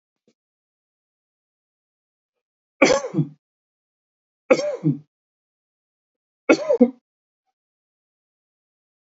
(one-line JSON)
{"three_cough_length": "9.1 s", "three_cough_amplitude": 32606, "three_cough_signal_mean_std_ratio": 0.23, "survey_phase": "beta (2021-08-13 to 2022-03-07)", "age": "45-64", "gender": "Male", "wearing_mask": "No", "symptom_none": true, "smoker_status": "Ex-smoker", "respiratory_condition_asthma": false, "respiratory_condition_other": false, "recruitment_source": "REACT", "submission_delay": "2 days", "covid_test_result": "Negative", "covid_test_method": "RT-qPCR"}